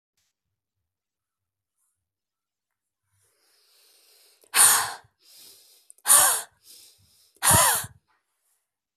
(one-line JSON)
{"exhalation_length": "9.0 s", "exhalation_amplitude": 25289, "exhalation_signal_mean_std_ratio": 0.27, "survey_phase": "beta (2021-08-13 to 2022-03-07)", "age": "45-64", "gender": "Female", "wearing_mask": "No", "symptom_runny_or_blocked_nose": true, "symptom_sore_throat": true, "symptom_diarrhoea": true, "symptom_fatigue": true, "symptom_headache": true, "symptom_onset": "3 days", "smoker_status": "Never smoked", "respiratory_condition_asthma": false, "respiratory_condition_other": false, "recruitment_source": "Test and Trace", "submission_delay": "2 days", "covid_test_result": "Positive", "covid_test_method": "RT-qPCR", "covid_ct_value": 18.8, "covid_ct_gene": "ORF1ab gene", "covid_ct_mean": 19.2, "covid_viral_load": "510000 copies/ml", "covid_viral_load_category": "Low viral load (10K-1M copies/ml)"}